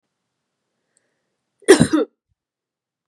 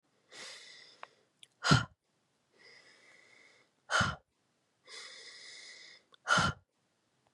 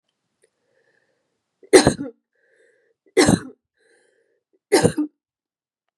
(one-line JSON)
{"cough_length": "3.1 s", "cough_amplitude": 32768, "cough_signal_mean_std_ratio": 0.22, "exhalation_length": "7.3 s", "exhalation_amplitude": 8422, "exhalation_signal_mean_std_ratio": 0.28, "three_cough_length": "6.0 s", "three_cough_amplitude": 32768, "three_cough_signal_mean_std_ratio": 0.25, "survey_phase": "beta (2021-08-13 to 2022-03-07)", "age": "18-44", "gender": "Female", "wearing_mask": "No", "symptom_cough_any": true, "symptom_runny_or_blocked_nose": true, "symptom_sore_throat": true, "symptom_fatigue": true, "symptom_fever_high_temperature": true, "symptom_headache": true, "symptom_change_to_sense_of_smell_or_taste": true, "symptom_onset": "6 days", "smoker_status": "Never smoked", "respiratory_condition_asthma": false, "respiratory_condition_other": false, "recruitment_source": "Test and Trace", "submission_delay": "2 days", "covid_test_result": "Positive", "covid_test_method": "ePCR"}